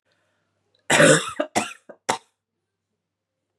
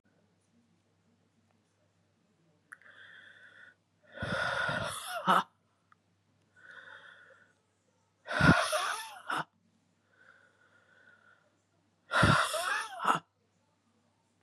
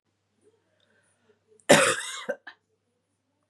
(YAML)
three_cough_length: 3.6 s
three_cough_amplitude: 29349
three_cough_signal_mean_std_ratio: 0.3
exhalation_length: 14.4 s
exhalation_amplitude: 11183
exhalation_signal_mean_std_ratio: 0.34
cough_length: 3.5 s
cough_amplitude: 26763
cough_signal_mean_std_ratio: 0.24
survey_phase: beta (2021-08-13 to 2022-03-07)
age: 18-44
gender: Female
wearing_mask: 'No'
symptom_cough_any: true
symptom_runny_or_blocked_nose: true
symptom_other: true
smoker_status: Never smoked
respiratory_condition_asthma: false
respiratory_condition_other: false
recruitment_source: Test and Trace
submission_delay: 2 days
covid_test_result: Positive
covid_test_method: LFT